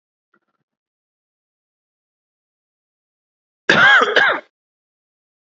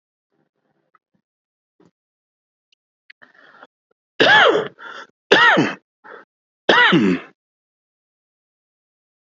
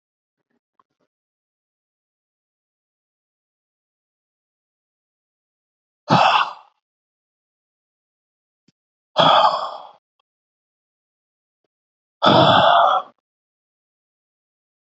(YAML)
cough_length: 5.5 s
cough_amplitude: 29119
cough_signal_mean_std_ratio: 0.28
three_cough_length: 9.3 s
three_cough_amplitude: 32768
three_cough_signal_mean_std_ratio: 0.32
exhalation_length: 14.8 s
exhalation_amplitude: 28278
exhalation_signal_mean_std_ratio: 0.27
survey_phase: beta (2021-08-13 to 2022-03-07)
age: 45-64
gender: Male
wearing_mask: 'No'
symptom_cough_any: true
symptom_runny_or_blocked_nose: true
symptom_onset: 7 days
smoker_status: Never smoked
respiratory_condition_asthma: false
respiratory_condition_other: false
recruitment_source: REACT
submission_delay: 0 days
covid_test_result: Negative
covid_test_method: RT-qPCR
influenza_a_test_result: Negative
influenza_b_test_result: Negative